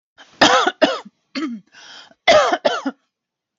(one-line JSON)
{"cough_length": "3.6 s", "cough_amplitude": 32768, "cough_signal_mean_std_ratio": 0.44, "survey_phase": "beta (2021-08-13 to 2022-03-07)", "age": "45-64", "gender": "Female", "wearing_mask": "No", "symptom_none": true, "smoker_status": "Ex-smoker", "respiratory_condition_asthma": false, "respiratory_condition_other": false, "recruitment_source": "REACT", "submission_delay": "19 days", "covid_test_result": "Negative", "covid_test_method": "RT-qPCR", "influenza_a_test_result": "Negative", "influenza_b_test_result": "Negative"}